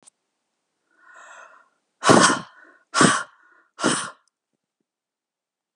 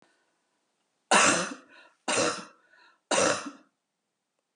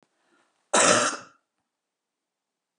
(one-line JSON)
{"exhalation_length": "5.8 s", "exhalation_amplitude": 25969, "exhalation_signal_mean_std_ratio": 0.29, "three_cough_length": "4.6 s", "three_cough_amplitude": 13534, "three_cough_signal_mean_std_ratio": 0.38, "cough_length": "2.8 s", "cough_amplitude": 19720, "cough_signal_mean_std_ratio": 0.31, "survey_phase": "beta (2021-08-13 to 2022-03-07)", "age": "45-64", "gender": "Female", "wearing_mask": "No", "symptom_none": true, "smoker_status": "Never smoked", "respiratory_condition_asthma": false, "respiratory_condition_other": false, "recruitment_source": "REACT", "submission_delay": "1 day", "covid_test_result": "Negative", "covid_test_method": "RT-qPCR", "influenza_a_test_result": "Negative", "influenza_b_test_result": "Negative"}